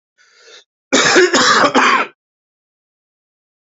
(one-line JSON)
{"cough_length": "3.8 s", "cough_amplitude": 32767, "cough_signal_mean_std_ratio": 0.46, "survey_phase": "alpha (2021-03-01 to 2021-08-12)", "age": "45-64", "gender": "Male", "wearing_mask": "No", "symptom_cough_any": true, "symptom_fever_high_temperature": true, "symptom_headache": true, "symptom_onset": "3 days", "smoker_status": "Ex-smoker", "respiratory_condition_asthma": true, "respiratory_condition_other": false, "recruitment_source": "Test and Trace", "submission_delay": "2 days", "covid_test_result": "Positive", "covid_test_method": "RT-qPCR", "covid_ct_value": 20.0, "covid_ct_gene": "ORF1ab gene"}